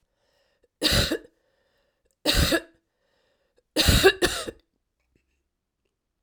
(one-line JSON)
{"three_cough_length": "6.2 s", "three_cough_amplitude": 21200, "three_cough_signal_mean_std_ratio": 0.34, "survey_phase": "alpha (2021-03-01 to 2021-08-12)", "age": "65+", "gender": "Female", "wearing_mask": "No", "symptom_cough_any": true, "symptom_new_continuous_cough": true, "symptom_fatigue": true, "symptom_headache": true, "symptom_change_to_sense_of_smell_or_taste": true, "symptom_loss_of_taste": true, "smoker_status": "Never smoked", "respiratory_condition_asthma": false, "respiratory_condition_other": false, "recruitment_source": "Test and Trace", "submission_delay": "2 days", "covid_test_result": "Positive", "covid_test_method": "RT-qPCR"}